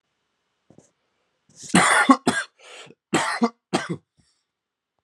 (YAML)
cough_length: 5.0 s
cough_amplitude: 29705
cough_signal_mean_std_ratio: 0.34
survey_phase: alpha (2021-03-01 to 2021-08-12)
age: 18-44
gender: Male
wearing_mask: 'No'
symptom_cough_any: true
symptom_shortness_of_breath: true
symptom_fatigue: true
symptom_headache: true
symptom_change_to_sense_of_smell_or_taste: true
symptom_loss_of_taste: true
symptom_onset: 3 days
smoker_status: Never smoked
respiratory_condition_asthma: false
respiratory_condition_other: false
recruitment_source: Test and Trace
submission_delay: 2 days
covid_test_result: Positive
covid_test_method: RT-qPCR
covid_ct_value: 15.1
covid_ct_gene: ORF1ab gene
covid_ct_mean: 15.4
covid_viral_load: 8600000 copies/ml
covid_viral_load_category: High viral load (>1M copies/ml)